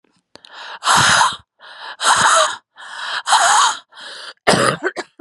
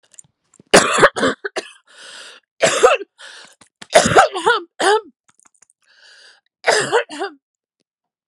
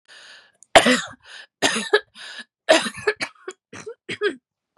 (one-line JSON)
{"exhalation_length": "5.2 s", "exhalation_amplitude": 32767, "exhalation_signal_mean_std_ratio": 0.58, "cough_length": "8.3 s", "cough_amplitude": 32768, "cough_signal_mean_std_ratio": 0.39, "three_cough_length": "4.8 s", "three_cough_amplitude": 32768, "three_cough_signal_mean_std_ratio": 0.35, "survey_phase": "beta (2021-08-13 to 2022-03-07)", "age": "18-44", "gender": "Female", "wearing_mask": "No", "symptom_cough_any": true, "symptom_runny_or_blocked_nose": true, "symptom_shortness_of_breath": true, "symptom_sore_throat": true, "symptom_diarrhoea": true, "symptom_fatigue": true, "symptom_fever_high_temperature": true, "symptom_headache": true, "symptom_change_to_sense_of_smell_or_taste": true, "symptom_other": true, "smoker_status": "Current smoker (e-cigarettes or vapes only)", "respiratory_condition_asthma": false, "respiratory_condition_other": false, "recruitment_source": "Test and Trace", "submission_delay": "2 days", "covid_test_result": "Positive", "covid_test_method": "ePCR"}